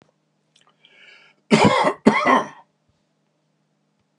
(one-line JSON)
{"cough_length": "4.2 s", "cough_amplitude": 32768, "cough_signal_mean_std_ratio": 0.34, "survey_phase": "beta (2021-08-13 to 2022-03-07)", "age": "65+", "gender": "Male", "wearing_mask": "No", "symptom_none": true, "smoker_status": "Ex-smoker", "respiratory_condition_asthma": false, "respiratory_condition_other": false, "recruitment_source": "REACT", "submission_delay": "1 day", "covid_test_result": "Negative", "covid_test_method": "RT-qPCR"}